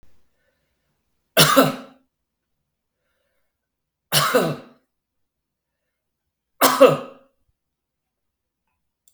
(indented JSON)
{
  "three_cough_length": "9.1 s",
  "three_cough_amplitude": 32768,
  "three_cough_signal_mean_std_ratio": 0.26,
  "survey_phase": "beta (2021-08-13 to 2022-03-07)",
  "age": "45-64",
  "gender": "Male",
  "wearing_mask": "No",
  "symptom_change_to_sense_of_smell_or_taste": true,
  "symptom_onset": "3 days",
  "smoker_status": "Ex-smoker",
  "respiratory_condition_asthma": false,
  "respiratory_condition_other": false,
  "recruitment_source": "Test and Trace",
  "submission_delay": "2 days",
  "covid_test_result": "Positive",
  "covid_test_method": "RT-qPCR"
}